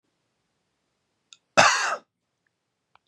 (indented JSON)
{
  "cough_length": "3.1 s",
  "cough_amplitude": 25138,
  "cough_signal_mean_std_ratio": 0.25,
  "survey_phase": "beta (2021-08-13 to 2022-03-07)",
  "age": "18-44",
  "gender": "Male",
  "wearing_mask": "No",
  "symptom_cough_any": true,
  "symptom_runny_or_blocked_nose": true,
  "symptom_fatigue": true,
  "symptom_other": true,
  "smoker_status": "Never smoked",
  "respiratory_condition_asthma": false,
  "respiratory_condition_other": false,
  "recruitment_source": "Test and Trace",
  "submission_delay": "1 day",
  "covid_test_result": "Positive",
  "covid_test_method": "RT-qPCR",
  "covid_ct_value": 27.1,
  "covid_ct_gene": "N gene"
}